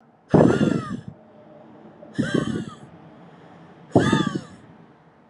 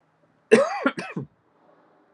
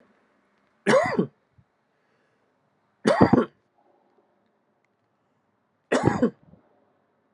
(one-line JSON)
{"exhalation_length": "5.3 s", "exhalation_amplitude": 29983, "exhalation_signal_mean_std_ratio": 0.42, "cough_length": "2.1 s", "cough_amplitude": 28941, "cough_signal_mean_std_ratio": 0.32, "three_cough_length": "7.3 s", "three_cough_amplitude": 29166, "three_cough_signal_mean_std_ratio": 0.28, "survey_phase": "beta (2021-08-13 to 2022-03-07)", "age": "18-44", "gender": "Male", "wearing_mask": "No", "symptom_cough_any": true, "symptom_runny_or_blocked_nose": true, "symptom_fever_high_temperature": true, "symptom_change_to_sense_of_smell_or_taste": true, "symptom_loss_of_taste": true, "smoker_status": "Never smoked", "respiratory_condition_asthma": false, "respiratory_condition_other": false, "recruitment_source": "Test and Trace", "submission_delay": "2 days", "covid_test_result": "Positive", "covid_test_method": "RT-qPCR"}